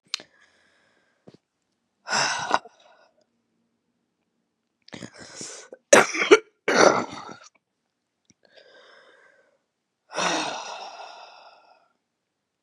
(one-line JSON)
{"exhalation_length": "12.6 s", "exhalation_amplitude": 32767, "exhalation_signal_mean_std_ratio": 0.26, "survey_phase": "beta (2021-08-13 to 2022-03-07)", "age": "45-64", "gender": "Female", "wearing_mask": "No", "symptom_cough_any": true, "symptom_runny_or_blocked_nose": true, "symptom_sore_throat": true, "symptom_onset": "1 day", "smoker_status": "Ex-smoker", "respiratory_condition_asthma": false, "respiratory_condition_other": false, "recruitment_source": "Test and Trace", "submission_delay": "1 day", "covid_test_result": "Positive", "covid_test_method": "LAMP"}